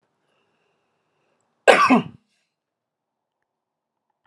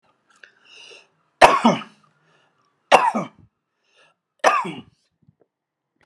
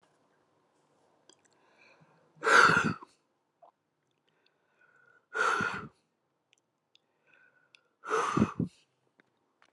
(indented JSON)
{
  "cough_length": "4.3 s",
  "cough_amplitude": 32768,
  "cough_signal_mean_std_ratio": 0.21,
  "three_cough_length": "6.1 s",
  "three_cough_amplitude": 32768,
  "three_cough_signal_mean_std_ratio": 0.27,
  "exhalation_length": "9.7 s",
  "exhalation_amplitude": 12278,
  "exhalation_signal_mean_std_ratio": 0.28,
  "survey_phase": "alpha (2021-03-01 to 2021-08-12)",
  "age": "65+",
  "gender": "Male",
  "wearing_mask": "No",
  "symptom_none": true,
  "smoker_status": "Ex-smoker",
  "respiratory_condition_asthma": false,
  "respiratory_condition_other": false,
  "recruitment_source": "REACT",
  "submission_delay": "2 days",
  "covid_test_result": "Negative",
  "covid_test_method": "RT-qPCR"
}